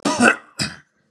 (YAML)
cough_length: 1.1 s
cough_amplitude: 32739
cough_signal_mean_std_ratio: 0.46
survey_phase: beta (2021-08-13 to 2022-03-07)
age: 45-64
gender: Male
wearing_mask: 'No'
symptom_none: true
smoker_status: Never smoked
respiratory_condition_asthma: false
respiratory_condition_other: false
recruitment_source: Test and Trace
submission_delay: 1 day
covid_test_result: Negative
covid_test_method: RT-qPCR